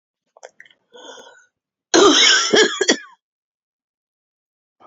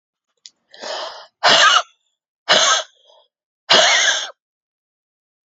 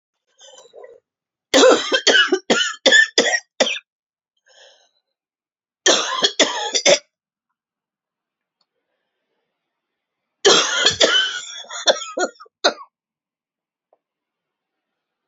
{
  "cough_length": "4.9 s",
  "cough_amplitude": 32767,
  "cough_signal_mean_std_ratio": 0.36,
  "exhalation_length": "5.5 s",
  "exhalation_amplitude": 32156,
  "exhalation_signal_mean_std_ratio": 0.42,
  "three_cough_length": "15.3 s",
  "three_cough_amplitude": 32768,
  "three_cough_signal_mean_std_ratio": 0.37,
  "survey_phase": "beta (2021-08-13 to 2022-03-07)",
  "age": "45-64",
  "gender": "Female",
  "wearing_mask": "No",
  "symptom_cough_any": true,
  "symptom_runny_or_blocked_nose": true,
  "symptom_shortness_of_breath": true,
  "symptom_abdominal_pain": true,
  "symptom_fatigue": true,
  "symptom_fever_high_temperature": true,
  "symptom_headache": true,
  "symptom_change_to_sense_of_smell_or_taste": true,
  "symptom_loss_of_taste": true,
  "smoker_status": "Never smoked",
  "respiratory_condition_asthma": false,
  "respiratory_condition_other": false,
  "recruitment_source": "Test and Trace",
  "submission_delay": "2 days",
  "covid_test_result": "Positive",
  "covid_test_method": "LFT"
}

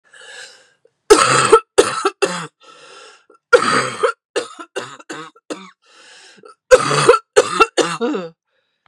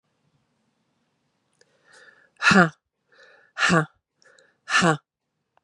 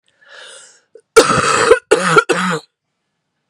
{
  "three_cough_length": "8.9 s",
  "three_cough_amplitude": 32768,
  "three_cough_signal_mean_std_ratio": 0.41,
  "exhalation_length": "5.6 s",
  "exhalation_amplitude": 28042,
  "exhalation_signal_mean_std_ratio": 0.28,
  "cough_length": "3.5 s",
  "cough_amplitude": 32768,
  "cough_signal_mean_std_ratio": 0.46,
  "survey_phase": "beta (2021-08-13 to 2022-03-07)",
  "age": "45-64",
  "gender": "Female",
  "wearing_mask": "No",
  "symptom_cough_any": true,
  "symptom_new_continuous_cough": true,
  "symptom_runny_or_blocked_nose": true,
  "symptom_shortness_of_breath": true,
  "symptom_fatigue": true,
  "symptom_headache": true,
  "smoker_status": "Never smoked",
  "respiratory_condition_asthma": false,
  "respiratory_condition_other": false,
  "recruitment_source": "Test and Trace",
  "submission_delay": "3 days",
  "covid_test_result": "Positive",
  "covid_test_method": "ePCR"
}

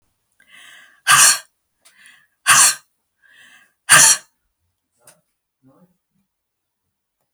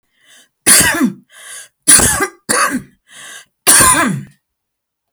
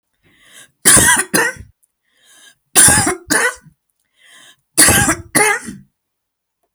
{
  "exhalation_length": "7.3 s",
  "exhalation_amplitude": 32768,
  "exhalation_signal_mean_std_ratio": 0.28,
  "cough_length": "5.1 s",
  "cough_amplitude": 32768,
  "cough_signal_mean_std_ratio": 0.48,
  "three_cough_length": "6.7 s",
  "three_cough_amplitude": 32768,
  "three_cough_signal_mean_std_ratio": 0.43,
  "survey_phase": "beta (2021-08-13 to 2022-03-07)",
  "age": "65+",
  "gender": "Female",
  "wearing_mask": "No",
  "symptom_none": true,
  "smoker_status": "Never smoked",
  "respiratory_condition_asthma": false,
  "respiratory_condition_other": false,
  "recruitment_source": "REACT",
  "submission_delay": "9 days",
  "covid_test_result": "Negative",
  "covid_test_method": "RT-qPCR"
}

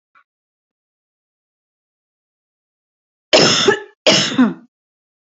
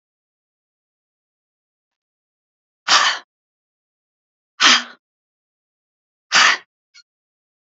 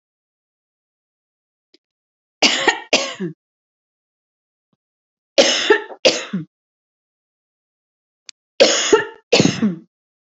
{
  "cough_length": "5.3 s",
  "cough_amplitude": 29176,
  "cough_signal_mean_std_ratio": 0.32,
  "exhalation_length": "7.8 s",
  "exhalation_amplitude": 32655,
  "exhalation_signal_mean_std_ratio": 0.24,
  "three_cough_length": "10.3 s",
  "three_cough_amplitude": 32768,
  "three_cough_signal_mean_std_ratio": 0.33,
  "survey_phase": "beta (2021-08-13 to 2022-03-07)",
  "age": "45-64",
  "gender": "Female",
  "wearing_mask": "No",
  "symptom_none": true,
  "smoker_status": "Never smoked",
  "respiratory_condition_asthma": true,
  "respiratory_condition_other": false,
  "recruitment_source": "REACT",
  "submission_delay": "2 days",
  "covid_test_result": "Negative",
  "covid_test_method": "RT-qPCR"
}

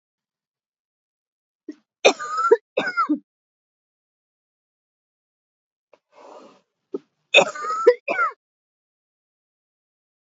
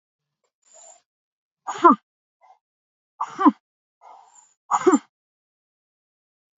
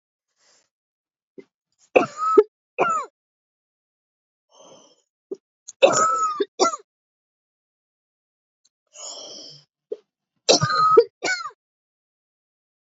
{
  "cough_length": "10.2 s",
  "cough_amplitude": 29369,
  "cough_signal_mean_std_ratio": 0.26,
  "exhalation_length": "6.6 s",
  "exhalation_amplitude": 27207,
  "exhalation_signal_mean_std_ratio": 0.22,
  "three_cough_length": "12.9 s",
  "three_cough_amplitude": 29353,
  "three_cough_signal_mean_std_ratio": 0.31,
  "survey_phase": "beta (2021-08-13 to 2022-03-07)",
  "age": "45-64",
  "gender": "Female",
  "wearing_mask": "No",
  "symptom_cough_any": true,
  "symptom_runny_or_blocked_nose": true,
  "symptom_sore_throat": true,
  "symptom_abdominal_pain": true,
  "symptom_fatigue": true,
  "symptom_headache": true,
  "symptom_onset": "3 days",
  "smoker_status": "Prefer not to say",
  "respiratory_condition_asthma": false,
  "respiratory_condition_other": false,
  "recruitment_source": "Test and Trace",
  "submission_delay": "1 day",
  "covid_test_result": "Positive",
  "covid_test_method": "RT-qPCR",
  "covid_ct_value": 22.4,
  "covid_ct_gene": "ORF1ab gene",
  "covid_ct_mean": 22.4,
  "covid_viral_load": "44000 copies/ml",
  "covid_viral_load_category": "Low viral load (10K-1M copies/ml)"
}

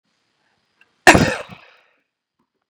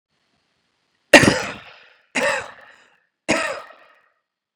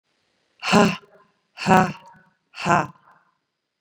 {
  "cough_length": "2.7 s",
  "cough_amplitude": 32768,
  "cough_signal_mean_std_ratio": 0.22,
  "three_cough_length": "4.6 s",
  "three_cough_amplitude": 32768,
  "three_cough_signal_mean_std_ratio": 0.28,
  "exhalation_length": "3.8 s",
  "exhalation_amplitude": 30171,
  "exhalation_signal_mean_std_ratio": 0.32,
  "survey_phase": "beta (2021-08-13 to 2022-03-07)",
  "age": "18-44",
  "gender": "Female",
  "wearing_mask": "No",
  "symptom_runny_or_blocked_nose": true,
  "symptom_onset": "3 days",
  "smoker_status": "Ex-smoker",
  "respiratory_condition_asthma": false,
  "respiratory_condition_other": false,
  "recruitment_source": "Test and Trace",
  "submission_delay": "1 day",
  "covid_test_result": "Positive",
  "covid_test_method": "RT-qPCR",
  "covid_ct_value": 32.1,
  "covid_ct_gene": "ORF1ab gene"
}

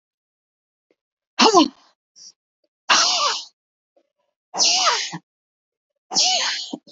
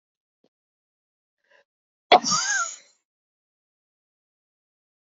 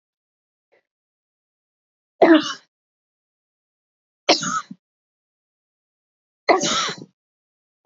{
  "exhalation_length": "6.9 s",
  "exhalation_amplitude": 29628,
  "exhalation_signal_mean_std_ratio": 0.41,
  "cough_length": "5.1 s",
  "cough_amplitude": 28082,
  "cough_signal_mean_std_ratio": 0.21,
  "three_cough_length": "7.9 s",
  "three_cough_amplitude": 26876,
  "three_cough_signal_mean_std_ratio": 0.25,
  "survey_phase": "beta (2021-08-13 to 2022-03-07)",
  "age": "45-64",
  "gender": "Female",
  "wearing_mask": "No",
  "symptom_runny_or_blocked_nose": true,
  "symptom_fatigue": true,
  "symptom_other": true,
  "smoker_status": "Never smoked",
  "respiratory_condition_asthma": false,
  "respiratory_condition_other": false,
  "recruitment_source": "Test and Trace",
  "submission_delay": "1 day",
  "covid_test_result": "Positive",
  "covid_test_method": "RT-qPCR",
  "covid_ct_value": 22.5,
  "covid_ct_gene": "ORF1ab gene"
}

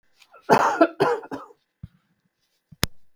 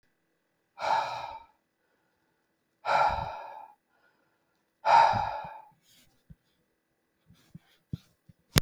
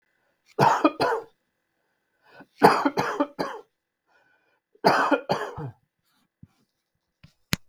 {
  "cough_length": "3.2 s",
  "cough_amplitude": 32766,
  "cough_signal_mean_std_ratio": 0.35,
  "exhalation_length": "8.6 s",
  "exhalation_amplitude": 32766,
  "exhalation_signal_mean_std_ratio": 0.32,
  "three_cough_length": "7.7 s",
  "three_cough_amplitude": 32768,
  "three_cough_signal_mean_std_ratio": 0.35,
  "survey_phase": "beta (2021-08-13 to 2022-03-07)",
  "age": "45-64",
  "gender": "Male",
  "wearing_mask": "No",
  "symptom_new_continuous_cough": true,
  "symptom_runny_or_blocked_nose": true,
  "symptom_abdominal_pain": true,
  "symptom_fatigue": true,
  "symptom_change_to_sense_of_smell_or_taste": true,
  "symptom_loss_of_taste": true,
  "symptom_onset": "5 days",
  "smoker_status": "Never smoked",
  "respiratory_condition_asthma": false,
  "respiratory_condition_other": false,
  "recruitment_source": "Test and Trace",
  "submission_delay": "2 days",
  "covid_test_result": "Positive",
  "covid_test_method": "RT-qPCR",
  "covid_ct_value": 15.4,
  "covid_ct_gene": "ORF1ab gene",
  "covid_ct_mean": 15.7,
  "covid_viral_load": "7300000 copies/ml",
  "covid_viral_load_category": "High viral load (>1M copies/ml)"
}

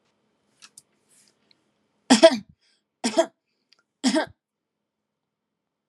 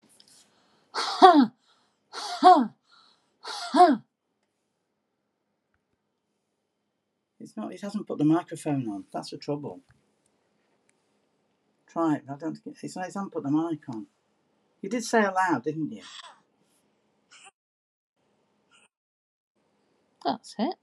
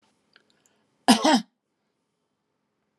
{
  "three_cough_length": "5.9 s",
  "three_cough_amplitude": 29344,
  "three_cough_signal_mean_std_ratio": 0.22,
  "exhalation_length": "20.8 s",
  "exhalation_amplitude": 31669,
  "exhalation_signal_mean_std_ratio": 0.32,
  "cough_length": "3.0 s",
  "cough_amplitude": 24978,
  "cough_signal_mean_std_ratio": 0.24,
  "survey_phase": "alpha (2021-03-01 to 2021-08-12)",
  "age": "45-64",
  "gender": "Female",
  "wearing_mask": "No",
  "symptom_none": true,
  "smoker_status": "Never smoked",
  "respiratory_condition_asthma": false,
  "respiratory_condition_other": false,
  "recruitment_source": "REACT",
  "submission_delay": "1 day",
  "covid_test_result": "Negative",
  "covid_test_method": "RT-qPCR"
}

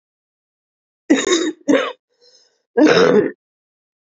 {
  "cough_length": "4.0 s",
  "cough_amplitude": 28128,
  "cough_signal_mean_std_ratio": 0.43,
  "survey_phase": "beta (2021-08-13 to 2022-03-07)",
  "age": "18-44",
  "gender": "Female",
  "wearing_mask": "No",
  "symptom_cough_any": true,
  "symptom_runny_or_blocked_nose": true,
  "symptom_sore_throat": true,
  "symptom_diarrhoea": true,
  "symptom_fatigue": true,
  "symptom_fever_high_temperature": true,
  "symptom_headache": true,
  "symptom_change_to_sense_of_smell_or_taste": true,
  "symptom_loss_of_taste": true,
  "symptom_onset": "4 days",
  "smoker_status": "Ex-smoker",
  "respiratory_condition_asthma": true,
  "respiratory_condition_other": false,
  "recruitment_source": "Test and Trace",
  "submission_delay": "1 day",
  "covid_test_result": "Positive",
  "covid_test_method": "RT-qPCR",
  "covid_ct_value": 15.4,
  "covid_ct_gene": "ORF1ab gene"
}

